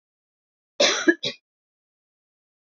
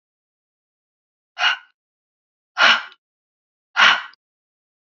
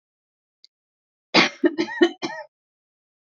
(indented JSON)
{
  "cough_length": "2.6 s",
  "cough_amplitude": 21809,
  "cough_signal_mean_std_ratio": 0.27,
  "exhalation_length": "4.9 s",
  "exhalation_amplitude": 28249,
  "exhalation_signal_mean_std_ratio": 0.27,
  "three_cough_length": "3.3 s",
  "three_cough_amplitude": 26086,
  "three_cough_signal_mean_std_ratio": 0.3,
  "survey_phase": "beta (2021-08-13 to 2022-03-07)",
  "age": "45-64",
  "gender": "Female",
  "wearing_mask": "No",
  "symptom_none": true,
  "smoker_status": "Never smoked",
  "respiratory_condition_asthma": false,
  "respiratory_condition_other": false,
  "recruitment_source": "REACT",
  "submission_delay": "2 days",
  "covid_test_result": "Negative",
  "covid_test_method": "RT-qPCR",
  "influenza_a_test_result": "Negative",
  "influenza_b_test_result": "Negative"
}